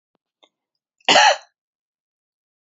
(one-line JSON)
{"cough_length": "2.6 s", "cough_amplitude": 27894, "cough_signal_mean_std_ratio": 0.26, "survey_phase": "alpha (2021-03-01 to 2021-08-12)", "age": "65+", "gender": "Female", "wearing_mask": "No", "symptom_none": true, "smoker_status": "Never smoked", "respiratory_condition_asthma": false, "respiratory_condition_other": false, "recruitment_source": "Test and Trace", "submission_delay": "2 days", "covid_test_result": "Negative", "covid_test_method": "RT-qPCR"}